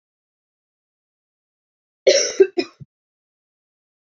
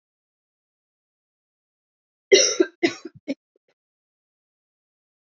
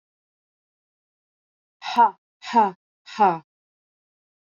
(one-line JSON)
{"cough_length": "4.1 s", "cough_amplitude": 27485, "cough_signal_mean_std_ratio": 0.22, "three_cough_length": "5.3 s", "three_cough_amplitude": 27202, "three_cough_signal_mean_std_ratio": 0.2, "exhalation_length": "4.5 s", "exhalation_amplitude": 16748, "exhalation_signal_mean_std_ratio": 0.27, "survey_phase": "beta (2021-08-13 to 2022-03-07)", "age": "18-44", "gender": "Female", "wearing_mask": "No", "symptom_cough_any": true, "symptom_shortness_of_breath": true, "symptom_sore_throat": true, "symptom_headache": true, "symptom_onset": "6 days", "smoker_status": "Never smoked", "respiratory_condition_asthma": false, "respiratory_condition_other": false, "recruitment_source": "Test and Trace", "submission_delay": "1 day", "covid_test_result": "Positive", "covid_test_method": "RT-qPCR", "covid_ct_value": 23.8, "covid_ct_gene": "ORF1ab gene"}